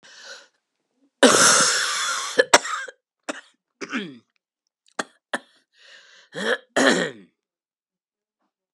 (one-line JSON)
{"cough_length": "8.7 s", "cough_amplitude": 32768, "cough_signal_mean_std_ratio": 0.36, "survey_phase": "beta (2021-08-13 to 2022-03-07)", "age": "65+", "gender": "Female", "wearing_mask": "No", "symptom_cough_any": true, "symptom_runny_or_blocked_nose": true, "symptom_change_to_sense_of_smell_or_taste": true, "symptom_onset": "5 days", "smoker_status": "Never smoked", "respiratory_condition_asthma": false, "respiratory_condition_other": false, "recruitment_source": "Test and Trace", "submission_delay": "3 days", "covid_test_result": "Positive", "covid_test_method": "RT-qPCR", "covid_ct_value": 14.8, "covid_ct_gene": "N gene", "covid_ct_mean": 16.5, "covid_viral_load": "3800000 copies/ml", "covid_viral_load_category": "High viral load (>1M copies/ml)"}